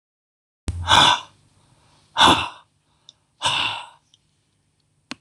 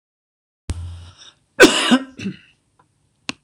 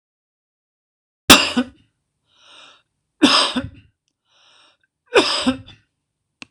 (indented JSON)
{
  "exhalation_length": "5.2 s",
  "exhalation_amplitude": 25820,
  "exhalation_signal_mean_std_ratio": 0.34,
  "cough_length": "3.4 s",
  "cough_amplitude": 26028,
  "cough_signal_mean_std_ratio": 0.3,
  "three_cough_length": "6.5 s",
  "three_cough_amplitude": 26028,
  "three_cough_signal_mean_std_ratio": 0.29,
  "survey_phase": "beta (2021-08-13 to 2022-03-07)",
  "age": "45-64",
  "gender": "Male",
  "wearing_mask": "No",
  "symptom_none": true,
  "smoker_status": "Never smoked",
  "respiratory_condition_asthma": false,
  "respiratory_condition_other": false,
  "recruitment_source": "REACT",
  "submission_delay": "2 days",
  "covid_test_result": "Negative",
  "covid_test_method": "RT-qPCR"
}